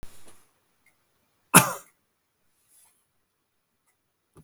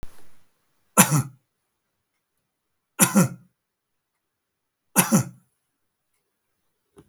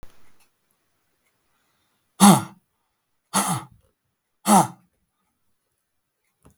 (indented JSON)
{
  "cough_length": "4.4 s",
  "cough_amplitude": 32768,
  "cough_signal_mean_std_ratio": 0.15,
  "three_cough_length": "7.1 s",
  "three_cough_amplitude": 32768,
  "three_cough_signal_mean_std_ratio": 0.26,
  "exhalation_length": "6.6 s",
  "exhalation_amplitude": 32766,
  "exhalation_signal_mean_std_ratio": 0.23,
  "survey_phase": "beta (2021-08-13 to 2022-03-07)",
  "age": "65+",
  "gender": "Male",
  "wearing_mask": "No",
  "symptom_none": true,
  "smoker_status": "Never smoked",
  "respiratory_condition_asthma": false,
  "respiratory_condition_other": false,
  "recruitment_source": "REACT",
  "submission_delay": "2 days",
  "covid_test_result": "Negative",
  "covid_test_method": "RT-qPCR",
  "influenza_a_test_result": "Negative",
  "influenza_b_test_result": "Negative"
}